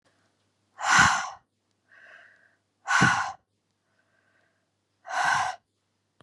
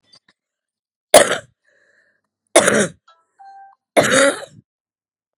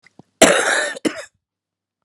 exhalation_length: 6.2 s
exhalation_amplitude: 16880
exhalation_signal_mean_std_ratio: 0.36
three_cough_length: 5.4 s
three_cough_amplitude: 32768
three_cough_signal_mean_std_ratio: 0.31
cough_length: 2.0 s
cough_amplitude: 32768
cough_signal_mean_std_ratio: 0.4
survey_phase: beta (2021-08-13 to 2022-03-07)
age: 45-64
gender: Female
wearing_mask: 'Yes'
symptom_cough_any: true
symptom_runny_or_blocked_nose: true
symptom_fatigue: true
symptom_headache: true
symptom_onset: 9 days
smoker_status: Never smoked
respiratory_condition_asthma: false
respiratory_condition_other: false
recruitment_source: Test and Trace
submission_delay: 1 day
covid_test_result: Positive
covid_test_method: RT-qPCR
covid_ct_value: 13.7
covid_ct_gene: ORF1ab gene
covid_ct_mean: 14.1
covid_viral_load: 25000000 copies/ml
covid_viral_load_category: High viral load (>1M copies/ml)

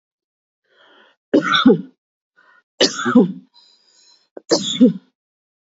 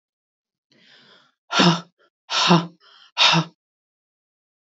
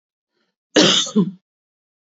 three_cough_length: 5.6 s
three_cough_amplitude: 32768
three_cough_signal_mean_std_ratio: 0.35
exhalation_length: 4.6 s
exhalation_amplitude: 25915
exhalation_signal_mean_std_ratio: 0.35
cough_length: 2.1 s
cough_amplitude: 29142
cough_signal_mean_std_ratio: 0.37
survey_phase: beta (2021-08-13 to 2022-03-07)
age: 45-64
gender: Female
wearing_mask: 'No'
symptom_cough_any: true
symptom_runny_or_blocked_nose: true
symptom_sore_throat: true
symptom_headache: true
symptom_other: true
symptom_onset: 7 days
smoker_status: Ex-smoker
respiratory_condition_asthma: false
respiratory_condition_other: false
recruitment_source: Test and Trace
submission_delay: 1 day
covid_test_result: Positive
covid_test_method: RT-qPCR
covid_ct_value: 29.0
covid_ct_gene: N gene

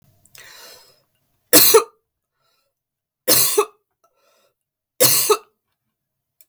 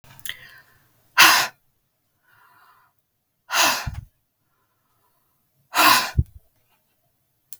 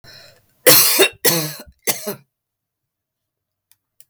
three_cough_length: 6.5 s
three_cough_amplitude: 32768
three_cough_signal_mean_std_ratio: 0.31
exhalation_length: 7.6 s
exhalation_amplitude: 32768
exhalation_signal_mean_std_ratio: 0.29
cough_length: 4.1 s
cough_amplitude: 32768
cough_signal_mean_std_ratio: 0.35
survey_phase: beta (2021-08-13 to 2022-03-07)
age: 45-64
gender: Female
wearing_mask: 'No'
symptom_none: true
smoker_status: Never smoked
respiratory_condition_asthma: false
respiratory_condition_other: false
recruitment_source: REACT
submission_delay: 2 days
covid_test_result: Negative
covid_test_method: RT-qPCR
influenza_a_test_result: Negative
influenza_b_test_result: Negative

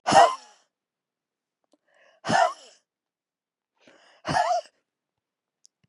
exhalation_length: 5.9 s
exhalation_amplitude: 21179
exhalation_signal_mean_std_ratio: 0.28
survey_phase: beta (2021-08-13 to 2022-03-07)
age: 45-64
gender: Female
wearing_mask: 'No'
symptom_none: true
smoker_status: Never smoked
respiratory_condition_asthma: false
respiratory_condition_other: false
recruitment_source: REACT
submission_delay: 1 day
covid_test_result: Negative
covid_test_method: RT-qPCR
influenza_a_test_result: Negative
influenza_b_test_result: Negative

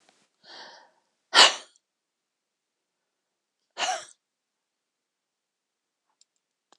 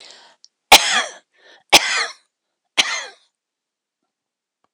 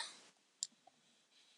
exhalation_length: 6.8 s
exhalation_amplitude: 25479
exhalation_signal_mean_std_ratio: 0.16
three_cough_length: 4.7 s
three_cough_amplitude: 26028
three_cough_signal_mean_std_ratio: 0.28
cough_length: 1.6 s
cough_amplitude: 2711
cough_signal_mean_std_ratio: 0.28
survey_phase: beta (2021-08-13 to 2022-03-07)
age: 65+
gender: Female
wearing_mask: 'No'
symptom_cough_any: true
symptom_shortness_of_breath: true
symptom_fatigue: true
symptom_fever_high_temperature: true
symptom_change_to_sense_of_smell_or_taste: true
symptom_loss_of_taste: true
symptom_onset: 12 days
smoker_status: Ex-smoker
respiratory_condition_asthma: true
respiratory_condition_other: true
recruitment_source: REACT
submission_delay: 2 days
covid_test_result: Negative
covid_test_method: RT-qPCR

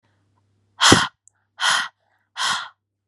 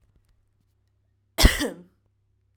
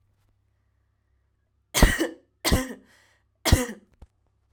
exhalation_length: 3.1 s
exhalation_amplitude: 32768
exhalation_signal_mean_std_ratio: 0.36
cough_length: 2.6 s
cough_amplitude: 32768
cough_signal_mean_std_ratio: 0.22
three_cough_length: 4.5 s
three_cough_amplitude: 25776
three_cough_signal_mean_std_ratio: 0.29
survey_phase: alpha (2021-03-01 to 2021-08-12)
age: 18-44
gender: Female
wearing_mask: 'No'
symptom_cough_any: true
smoker_status: Never smoked
respiratory_condition_asthma: false
respiratory_condition_other: false
recruitment_source: REACT
submission_delay: 2 days
covid_test_result: Negative
covid_test_method: RT-qPCR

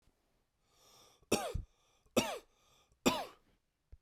three_cough_length: 4.0 s
three_cough_amplitude: 7233
three_cough_signal_mean_std_ratio: 0.3
survey_phase: beta (2021-08-13 to 2022-03-07)
age: 18-44
gender: Male
wearing_mask: 'No'
symptom_cough_any: true
symptom_runny_or_blocked_nose: true
symptom_shortness_of_breath: true
symptom_onset: 4 days
smoker_status: Never smoked
respiratory_condition_asthma: false
respiratory_condition_other: false
recruitment_source: Test and Trace
submission_delay: 2 days
covid_test_result: Positive
covid_test_method: RT-qPCR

